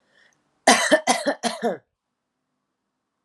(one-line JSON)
{"cough_length": "3.2 s", "cough_amplitude": 28581, "cough_signal_mean_std_ratio": 0.35, "survey_phase": "alpha (2021-03-01 to 2021-08-12)", "age": "18-44", "gender": "Female", "wearing_mask": "No", "symptom_none": true, "symptom_onset": "2 days", "smoker_status": "Current smoker (1 to 10 cigarettes per day)", "respiratory_condition_asthma": false, "respiratory_condition_other": false, "recruitment_source": "Test and Trace", "submission_delay": "2 days", "covid_test_result": "Positive", "covid_test_method": "RT-qPCR", "covid_ct_value": 26.3, "covid_ct_gene": "ORF1ab gene", "covid_ct_mean": 27.1, "covid_viral_load": "1300 copies/ml", "covid_viral_load_category": "Minimal viral load (< 10K copies/ml)"}